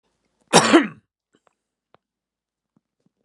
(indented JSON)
{
  "cough_length": "3.2 s",
  "cough_amplitude": 32767,
  "cough_signal_mean_std_ratio": 0.23,
  "survey_phase": "beta (2021-08-13 to 2022-03-07)",
  "age": "45-64",
  "gender": "Male",
  "wearing_mask": "No",
  "symptom_cough_any": true,
  "symptom_runny_or_blocked_nose": true,
  "symptom_change_to_sense_of_smell_or_taste": true,
  "symptom_onset": "5 days",
  "smoker_status": "Current smoker (1 to 10 cigarettes per day)",
  "respiratory_condition_asthma": false,
  "respiratory_condition_other": false,
  "recruitment_source": "Test and Trace",
  "submission_delay": "2 days",
  "covid_test_result": "Positive",
  "covid_test_method": "RT-qPCR"
}